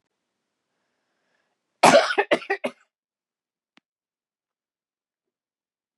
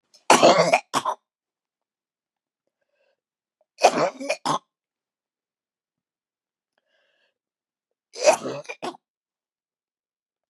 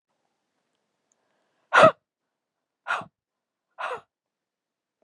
cough_length: 6.0 s
cough_amplitude: 30166
cough_signal_mean_std_ratio: 0.21
three_cough_length: 10.5 s
three_cough_amplitude: 31833
three_cough_signal_mean_std_ratio: 0.26
exhalation_length: 5.0 s
exhalation_amplitude: 26220
exhalation_signal_mean_std_ratio: 0.18
survey_phase: beta (2021-08-13 to 2022-03-07)
age: 45-64
gender: Female
wearing_mask: 'No'
symptom_cough_any: true
symptom_runny_or_blocked_nose: true
symptom_shortness_of_breath: true
symptom_sore_throat: true
symptom_abdominal_pain: true
symptom_fatigue: true
smoker_status: Never smoked
respiratory_condition_asthma: false
respiratory_condition_other: false
recruitment_source: Test and Trace
submission_delay: 5 days
covid_test_result: Negative
covid_test_method: RT-qPCR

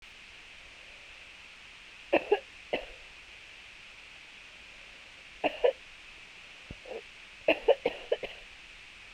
three_cough_length: 9.1 s
three_cough_amplitude: 10254
three_cough_signal_mean_std_ratio: 0.34
survey_phase: beta (2021-08-13 to 2022-03-07)
age: 45-64
gender: Female
wearing_mask: 'No'
symptom_runny_or_blocked_nose: true
symptom_fatigue: true
symptom_headache: true
symptom_change_to_sense_of_smell_or_taste: true
symptom_loss_of_taste: true
symptom_other: true
symptom_onset: 4 days
smoker_status: Current smoker (1 to 10 cigarettes per day)
respiratory_condition_asthma: true
respiratory_condition_other: false
recruitment_source: Test and Trace
submission_delay: 1 day
covid_test_result: Positive
covid_test_method: RT-qPCR
covid_ct_value: 18.4
covid_ct_gene: ORF1ab gene
covid_ct_mean: 19.1
covid_viral_load: 540000 copies/ml
covid_viral_load_category: Low viral load (10K-1M copies/ml)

